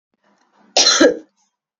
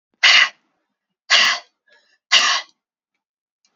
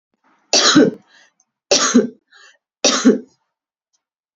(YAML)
cough_length: 1.8 s
cough_amplitude: 28853
cough_signal_mean_std_ratio: 0.38
exhalation_length: 3.8 s
exhalation_amplitude: 32249
exhalation_signal_mean_std_ratio: 0.37
three_cough_length: 4.4 s
three_cough_amplitude: 32008
three_cough_signal_mean_std_ratio: 0.39
survey_phase: beta (2021-08-13 to 2022-03-07)
age: 45-64
gender: Female
wearing_mask: 'No'
symptom_other: true
symptom_onset: 2 days
smoker_status: Prefer not to say
respiratory_condition_asthma: true
respiratory_condition_other: false
recruitment_source: REACT
submission_delay: 9 days
covid_test_result: Negative
covid_test_method: RT-qPCR
influenza_a_test_result: Negative
influenza_b_test_result: Negative